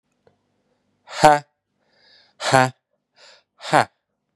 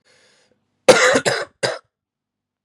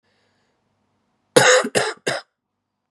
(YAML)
exhalation_length: 4.4 s
exhalation_amplitude: 32767
exhalation_signal_mean_std_ratio: 0.24
cough_length: 2.6 s
cough_amplitude: 32768
cough_signal_mean_std_ratio: 0.34
three_cough_length: 2.9 s
three_cough_amplitude: 32740
three_cough_signal_mean_std_ratio: 0.33
survey_phase: beta (2021-08-13 to 2022-03-07)
age: 18-44
gender: Male
wearing_mask: 'No'
symptom_cough_any: true
symptom_runny_or_blocked_nose: true
symptom_shortness_of_breath: true
symptom_fatigue: true
symptom_fever_high_temperature: true
symptom_headache: true
symptom_change_to_sense_of_smell_or_taste: true
symptom_loss_of_taste: true
symptom_other: true
symptom_onset: 2 days
smoker_status: Never smoked
respiratory_condition_asthma: false
respiratory_condition_other: false
recruitment_source: Test and Trace
submission_delay: 1 day
covid_test_result: Positive
covid_test_method: RT-qPCR
covid_ct_value: 18.8
covid_ct_gene: ORF1ab gene
covid_ct_mean: 19.1
covid_viral_load: 530000 copies/ml
covid_viral_load_category: Low viral load (10K-1M copies/ml)